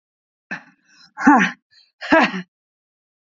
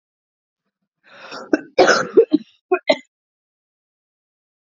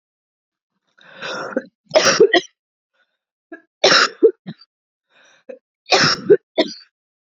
{"exhalation_length": "3.3 s", "exhalation_amplitude": 28434, "exhalation_signal_mean_std_ratio": 0.32, "cough_length": "4.8 s", "cough_amplitude": 28631, "cough_signal_mean_std_ratio": 0.27, "three_cough_length": "7.3 s", "three_cough_amplitude": 30613, "three_cough_signal_mean_std_ratio": 0.34, "survey_phase": "beta (2021-08-13 to 2022-03-07)", "age": "18-44", "gender": "Female", "wearing_mask": "No", "symptom_cough_any": true, "symptom_runny_or_blocked_nose": true, "symptom_sore_throat": true, "symptom_fatigue": true, "symptom_onset": "4 days", "smoker_status": "Never smoked", "respiratory_condition_asthma": false, "respiratory_condition_other": false, "recruitment_source": "Test and Trace", "submission_delay": "2 days", "covid_test_result": "Positive", "covid_test_method": "RT-qPCR", "covid_ct_value": 16.4, "covid_ct_gene": "ORF1ab gene", "covid_ct_mean": 16.5, "covid_viral_load": "3800000 copies/ml", "covid_viral_load_category": "High viral load (>1M copies/ml)"}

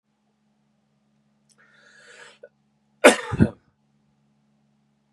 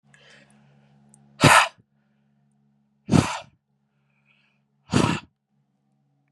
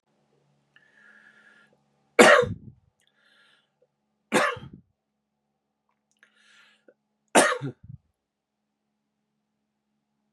{"cough_length": "5.1 s", "cough_amplitude": 32763, "cough_signal_mean_std_ratio": 0.17, "exhalation_length": "6.3 s", "exhalation_amplitude": 30615, "exhalation_signal_mean_std_ratio": 0.25, "three_cough_length": "10.3 s", "three_cough_amplitude": 32767, "three_cough_signal_mean_std_ratio": 0.2, "survey_phase": "beta (2021-08-13 to 2022-03-07)", "age": "45-64", "gender": "Male", "wearing_mask": "No", "symptom_none": true, "smoker_status": "Never smoked", "respiratory_condition_asthma": true, "respiratory_condition_other": false, "recruitment_source": "REACT", "submission_delay": "2 days", "covid_test_result": "Negative", "covid_test_method": "RT-qPCR"}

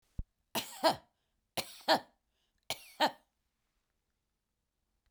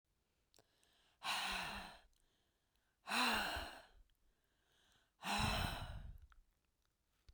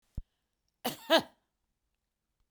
{"three_cough_length": "5.1 s", "three_cough_amplitude": 6473, "three_cough_signal_mean_std_ratio": 0.26, "exhalation_length": "7.3 s", "exhalation_amplitude": 2050, "exhalation_signal_mean_std_ratio": 0.45, "cough_length": "2.5 s", "cough_amplitude": 9609, "cough_signal_mean_std_ratio": 0.21, "survey_phase": "beta (2021-08-13 to 2022-03-07)", "age": "65+", "gender": "Female", "wearing_mask": "Yes", "symptom_cough_any": true, "symptom_shortness_of_breath": true, "symptom_fatigue": true, "symptom_headache": true, "symptom_onset": "12 days", "smoker_status": "Ex-smoker", "respiratory_condition_asthma": false, "respiratory_condition_other": false, "recruitment_source": "REACT", "submission_delay": "11 days", "covid_test_result": "Negative", "covid_test_method": "RT-qPCR", "influenza_a_test_result": "Negative", "influenza_b_test_result": "Negative"}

